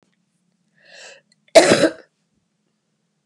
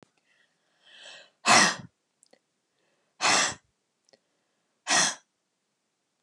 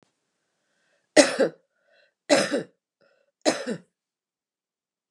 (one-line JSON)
{"cough_length": "3.3 s", "cough_amplitude": 32768, "cough_signal_mean_std_ratio": 0.24, "exhalation_length": "6.2 s", "exhalation_amplitude": 18225, "exhalation_signal_mean_std_ratio": 0.29, "three_cough_length": "5.1 s", "three_cough_amplitude": 30488, "three_cough_signal_mean_std_ratio": 0.27, "survey_phase": "beta (2021-08-13 to 2022-03-07)", "age": "65+", "gender": "Female", "wearing_mask": "No", "symptom_none": true, "smoker_status": "Ex-smoker", "respiratory_condition_asthma": false, "respiratory_condition_other": false, "recruitment_source": "REACT", "submission_delay": "2 days", "covid_test_result": "Negative", "covid_test_method": "RT-qPCR"}